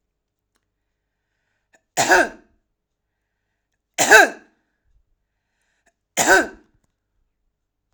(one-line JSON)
{"three_cough_length": "7.9 s", "three_cough_amplitude": 32768, "three_cough_signal_mean_std_ratio": 0.25, "survey_phase": "alpha (2021-03-01 to 2021-08-12)", "age": "45-64", "gender": "Female", "wearing_mask": "No", "symptom_none": true, "smoker_status": "Never smoked", "respiratory_condition_asthma": false, "respiratory_condition_other": false, "recruitment_source": "REACT", "submission_delay": "2 days", "covid_test_result": "Negative", "covid_test_method": "RT-qPCR"}